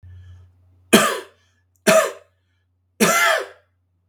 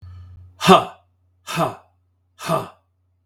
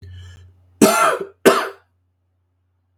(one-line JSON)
{"three_cough_length": "4.1 s", "three_cough_amplitude": 32768, "three_cough_signal_mean_std_ratio": 0.39, "exhalation_length": "3.3 s", "exhalation_amplitude": 32768, "exhalation_signal_mean_std_ratio": 0.31, "cough_length": "3.0 s", "cough_amplitude": 32768, "cough_signal_mean_std_ratio": 0.37, "survey_phase": "beta (2021-08-13 to 2022-03-07)", "age": "45-64", "gender": "Male", "wearing_mask": "No", "symptom_cough_any": true, "symptom_runny_or_blocked_nose": true, "symptom_sore_throat": true, "symptom_fatigue": true, "symptom_onset": "2 days", "smoker_status": "Never smoked", "respiratory_condition_asthma": true, "respiratory_condition_other": false, "recruitment_source": "Test and Trace", "submission_delay": "1 day", "covid_test_result": "Positive", "covid_test_method": "ePCR"}